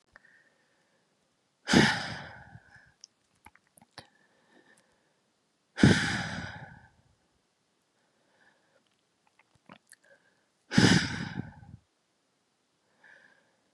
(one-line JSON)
{"exhalation_length": "13.7 s", "exhalation_amplitude": 14862, "exhalation_signal_mean_std_ratio": 0.24, "survey_phase": "beta (2021-08-13 to 2022-03-07)", "age": "18-44", "gender": "Female", "wearing_mask": "No", "symptom_cough_any": true, "symptom_new_continuous_cough": true, "symptom_shortness_of_breath": true, "symptom_fatigue": true, "symptom_headache": true, "symptom_onset": "3 days", "smoker_status": "Never smoked", "respiratory_condition_asthma": false, "respiratory_condition_other": false, "recruitment_source": "Test and Trace", "submission_delay": "2 days", "covid_test_result": "Positive", "covid_test_method": "RT-qPCR", "covid_ct_value": 15.7, "covid_ct_gene": "ORF1ab gene"}